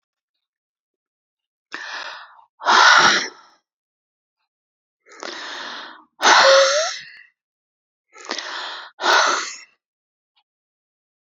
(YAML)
exhalation_length: 11.3 s
exhalation_amplitude: 31585
exhalation_signal_mean_std_ratio: 0.36
survey_phase: alpha (2021-03-01 to 2021-08-12)
age: 45-64
gender: Female
wearing_mask: 'No'
symptom_fatigue: true
smoker_status: Never smoked
recruitment_source: REACT
submission_delay: 3 days
covid_test_result: Negative
covid_test_method: RT-qPCR